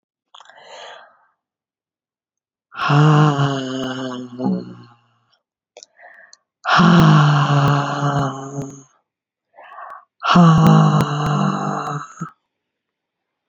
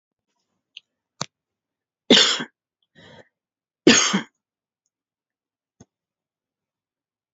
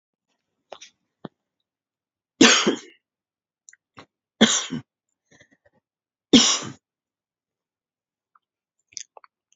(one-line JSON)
{"exhalation_length": "13.5 s", "exhalation_amplitude": 29915, "exhalation_signal_mean_std_ratio": 0.52, "cough_length": "7.3 s", "cough_amplitude": 30012, "cough_signal_mean_std_ratio": 0.21, "three_cough_length": "9.6 s", "three_cough_amplitude": 29170, "three_cough_signal_mean_std_ratio": 0.22, "survey_phase": "beta (2021-08-13 to 2022-03-07)", "age": "45-64", "gender": "Female", "wearing_mask": "No", "symptom_cough_any": true, "smoker_status": "Never smoked", "respiratory_condition_asthma": false, "respiratory_condition_other": false, "recruitment_source": "REACT", "submission_delay": "4 days", "covid_test_result": "Negative", "covid_test_method": "RT-qPCR", "influenza_a_test_result": "Negative", "influenza_b_test_result": "Negative"}